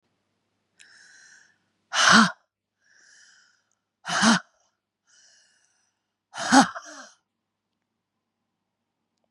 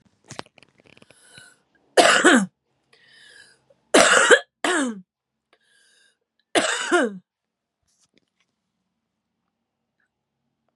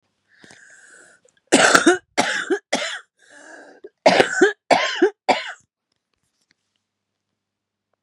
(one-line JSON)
{"exhalation_length": "9.3 s", "exhalation_amplitude": 24725, "exhalation_signal_mean_std_ratio": 0.24, "three_cough_length": "10.8 s", "three_cough_amplitude": 32767, "three_cough_signal_mean_std_ratio": 0.3, "cough_length": "8.0 s", "cough_amplitude": 32768, "cough_signal_mean_std_ratio": 0.36, "survey_phase": "beta (2021-08-13 to 2022-03-07)", "age": "45-64", "gender": "Female", "wearing_mask": "No", "symptom_cough_any": true, "symptom_runny_or_blocked_nose": true, "symptom_sore_throat": true, "symptom_diarrhoea": true, "symptom_fatigue": true, "symptom_fever_high_temperature": true, "symptom_headache": true, "smoker_status": "Current smoker (1 to 10 cigarettes per day)", "respiratory_condition_asthma": true, "respiratory_condition_other": false, "recruitment_source": "Test and Trace", "submission_delay": "2 days", "covid_test_result": "Positive", "covid_test_method": "ePCR"}